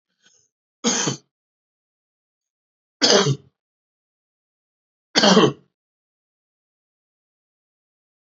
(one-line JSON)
{"three_cough_length": "8.4 s", "three_cough_amplitude": 31758, "three_cough_signal_mean_std_ratio": 0.26, "survey_phase": "beta (2021-08-13 to 2022-03-07)", "age": "65+", "gender": "Male", "wearing_mask": "No", "symptom_cough_any": true, "symptom_runny_or_blocked_nose": true, "symptom_shortness_of_breath": true, "symptom_sore_throat": true, "symptom_headache": true, "symptom_onset": "4 days", "smoker_status": "Ex-smoker", "respiratory_condition_asthma": true, "respiratory_condition_other": false, "recruitment_source": "Test and Trace", "submission_delay": "2 days", "covid_test_result": "Negative", "covid_test_method": "RT-qPCR"}